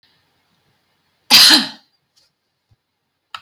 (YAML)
cough_length: 3.4 s
cough_amplitude: 32412
cough_signal_mean_std_ratio: 0.26
survey_phase: alpha (2021-03-01 to 2021-08-12)
age: 45-64
gender: Female
wearing_mask: 'No'
symptom_none: true
smoker_status: Prefer not to say
respiratory_condition_asthma: false
respiratory_condition_other: false
recruitment_source: REACT
submission_delay: 1 day
covid_test_result: Negative
covid_test_method: RT-qPCR